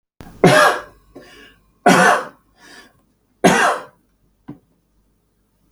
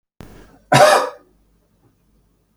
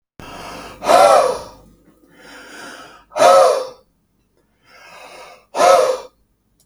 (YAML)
three_cough_length: 5.7 s
three_cough_amplitude: 32768
three_cough_signal_mean_std_ratio: 0.36
cough_length: 2.6 s
cough_amplitude: 32768
cough_signal_mean_std_ratio: 0.31
exhalation_length: 6.7 s
exhalation_amplitude: 32768
exhalation_signal_mean_std_ratio: 0.41
survey_phase: beta (2021-08-13 to 2022-03-07)
age: 18-44
gender: Male
wearing_mask: 'No'
symptom_none: true
smoker_status: Ex-smoker
respiratory_condition_asthma: false
respiratory_condition_other: false
recruitment_source: REACT
submission_delay: 7 days
covid_test_result: Negative
covid_test_method: RT-qPCR
influenza_a_test_result: Negative
influenza_b_test_result: Negative